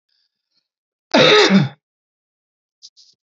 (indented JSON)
{
  "cough_length": "3.3 s",
  "cough_amplitude": 29481,
  "cough_signal_mean_std_ratio": 0.34,
  "survey_phase": "beta (2021-08-13 to 2022-03-07)",
  "age": "45-64",
  "gender": "Male",
  "wearing_mask": "No",
  "symptom_none": true,
  "smoker_status": "Never smoked",
  "respiratory_condition_asthma": false,
  "respiratory_condition_other": false,
  "recruitment_source": "REACT",
  "submission_delay": "3 days",
  "covid_test_result": "Negative",
  "covid_test_method": "RT-qPCR",
  "influenza_a_test_result": "Negative",
  "influenza_b_test_result": "Negative"
}